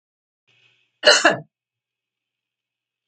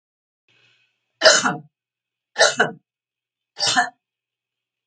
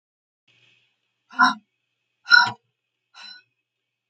{
  "cough_length": "3.1 s",
  "cough_amplitude": 32767,
  "cough_signal_mean_std_ratio": 0.23,
  "three_cough_length": "4.9 s",
  "three_cough_amplitude": 32767,
  "three_cough_signal_mean_std_ratio": 0.3,
  "exhalation_length": "4.1 s",
  "exhalation_amplitude": 32766,
  "exhalation_signal_mean_std_ratio": 0.22,
  "survey_phase": "beta (2021-08-13 to 2022-03-07)",
  "age": "65+",
  "gender": "Female",
  "wearing_mask": "No",
  "symptom_none": true,
  "smoker_status": "Never smoked",
  "respiratory_condition_asthma": false,
  "respiratory_condition_other": false,
  "recruitment_source": "REACT",
  "submission_delay": "2 days",
  "covid_test_result": "Negative",
  "covid_test_method": "RT-qPCR",
  "influenza_a_test_result": "Negative",
  "influenza_b_test_result": "Negative"
}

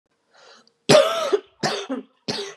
{
  "three_cough_length": "2.6 s",
  "three_cough_amplitude": 29828,
  "three_cough_signal_mean_std_ratio": 0.43,
  "survey_phase": "beta (2021-08-13 to 2022-03-07)",
  "age": "45-64",
  "gender": "Female",
  "wearing_mask": "No",
  "symptom_cough_any": true,
  "symptom_runny_or_blocked_nose": true,
  "symptom_fatigue": true,
  "smoker_status": "Never smoked",
  "respiratory_condition_asthma": false,
  "respiratory_condition_other": false,
  "recruitment_source": "Test and Trace",
  "submission_delay": "2 days",
  "covid_test_result": "Positive",
  "covid_test_method": "RT-qPCR",
  "covid_ct_value": 25.0,
  "covid_ct_gene": "ORF1ab gene"
}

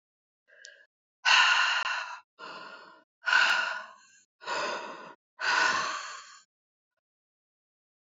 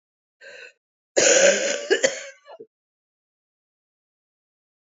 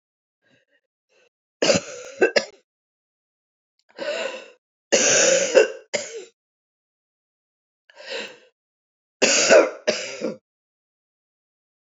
{
  "exhalation_length": "8.0 s",
  "exhalation_amplitude": 12725,
  "exhalation_signal_mean_std_ratio": 0.45,
  "cough_length": "4.9 s",
  "cough_amplitude": 23426,
  "cough_signal_mean_std_ratio": 0.33,
  "three_cough_length": "11.9 s",
  "three_cough_amplitude": 27629,
  "three_cough_signal_mean_std_ratio": 0.34,
  "survey_phase": "beta (2021-08-13 to 2022-03-07)",
  "age": "65+",
  "gender": "Female",
  "wearing_mask": "No",
  "symptom_cough_any": true,
  "symptom_new_continuous_cough": true,
  "symptom_runny_or_blocked_nose": true,
  "symptom_shortness_of_breath": true,
  "symptom_sore_throat": true,
  "symptom_fatigue": true,
  "symptom_onset": "2 days",
  "smoker_status": "Ex-smoker",
  "respiratory_condition_asthma": false,
  "respiratory_condition_other": false,
  "recruitment_source": "Test and Trace",
  "submission_delay": "1 day",
  "covid_test_result": "Positive",
  "covid_test_method": "RT-qPCR",
  "covid_ct_value": 17.6,
  "covid_ct_gene": "ORF1ab gene",
  "covid_ct_mean": 17.6,
  "covid_viral_load": "1600000 copies/ml",
  "covid_viral_load_category": "High viral load (>1M copies/ml)"
}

